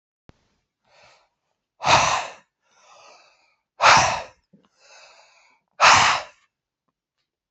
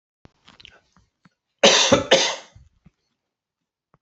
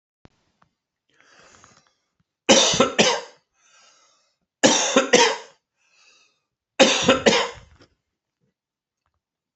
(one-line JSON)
{"exhalation_length": "7.5 s", "exhalation_amplitude": 29687, "exhalation_signal_mean_std_ratio": 0.31, "cough_length": "4.0 s", "cough_amplitude": 31013, "cough_signal_mean_std_ratio": 0.3, "three_cough_length": "9.6 s", "three_cough_amplitude": 31022, "three_cough_signal_mean_std_ratio": 0.34, "survey_phase": "beta (2021-08-13 to 2022-03-07)", "age": "65+", "gender": "Male", "wearing_mask": "No", "symptom_none": true, "smoker_status": "Never smoked", "respiratory_condition_asthma": false, "respiratory_condition_other": false, "recruitment_source": "REACT", "submission_delay": "1 day", "covid_test_result": "Negative", "covid_test_method": "RT-qPCR"}